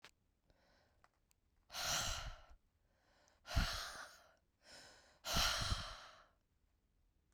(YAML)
exhalation_length: 7.3 s
exhalation_amplitude: 2300
exhalation_signal_mean_std_ratio: 0.41
survey_phase: beta (2021-08-13 to 2022-03-07)
age: 18-44
gender: Female
wearing_mask: 'No'
symptom_cough_any: true
symptom_sore_throat: true
smoker_status: Never smoked
respiratory_condition_asthma: false
respiratory_condition_other: false
recruitment_source: Test and Trace
submission_delay: 2 days
covid_test_result: Negative
covid_test_method: RT-qPCR